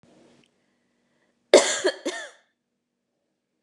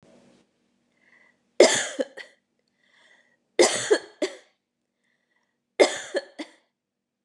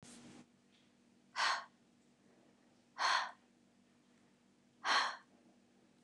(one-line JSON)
{"cough_length": "3.6 s", "cough_amplitude": 29204, "cough_signal_mean_std_ratio": 0.23, "three_cough_length": "7.2 s", "three_cough_amplitude": 29179, "three_cough_signal_mean_std_ratio": 0.26, "exhalation_length": "6.0 s", "exhalation_amplitude": 3003, "exhalation_signal_mean_std_ratio": 0.34, "survey_phase": "beta (2021-08-13 to 2022-03-07)", "age": "18-44", "gender": "Female", "wearing_mask": "No", "symptom_none": true, "smoker_status": "Never smoked", "respiratory_condition_asthma": false, "respiratory_condition_other": false, "recruitment_source": "REACT", "submission_delay": "1 day", "covid_test_result": "Negative", "covid_test_method": "RT-qPCR", "influenza_a_test_result": "Unknown/Void", "influenza_b_test_result": "Unknown/Void"}